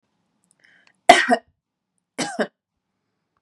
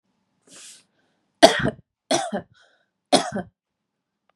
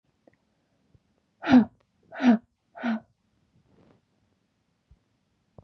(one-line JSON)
{"cough_length": "3.4 s", "cough_amplitude": 32768, "cough_signal_mean_std_ratio": 0.22, "three_cough_length": "4.4 s", "three_cough_amplitude": 32768, "three_cough_signal_mean_std_ratio": 0.26, "exhalation_length": "5.6 s", "exhalation_amplitude": 16834, "exhalation_signal_mean_std_ratio": 0.23, "survey_phase": "beta (2021-08-13 to 2022-03-07)", "age": "18-44", "gender": "Female", "wearing_mask": "No", "symptom_none": true, "smoker_status": "Current smoker (1 to 10 cigarettes per day)", "respiratory_condition_asthma": false, "respiratory_condition_other": false, "recruitment_source": "REACT", "submission_delay": "2 days", "covid_test_result": "Negative", "covid_test_method": "RT-qPCR", "influenza_a_test_result": "Negative", "influenza_b_test_result": "Negative"}